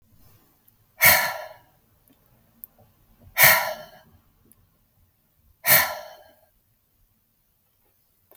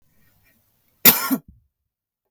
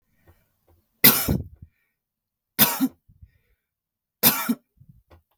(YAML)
exhalation_length: 8.4 s
exhalation_amplitude: 32593
exhalation_signal_mean_std_ratio: 0.26
cough_length: 2.3 s
cough_amplitude: 32768
cough_signal_mean_std_ratio: 0.23
three_cough_length: 5.4 s
three_cough_amplitude: 32768
three_cough_signal_mean_std_ratio: 0.29
survey_phase: beta (2021-08-13 to 2022-03-07)
age: 45-64
gender: Female
wearing_mask: 'No'
symptom_cough_any: true
symptom_runny_or_blocked_nose: true
symptom_onset: 12 days
smoker_status: Ex-smoker
respiratory_condition_asthma: false
respiratory_condition_other: false
recruitment_source: REACT
submission_delay: 1 day
covid_test_result: Negative
covid_test_method: RT-qPCR
influenza_a_test_result: Negative
influenza_b_test_result: Negative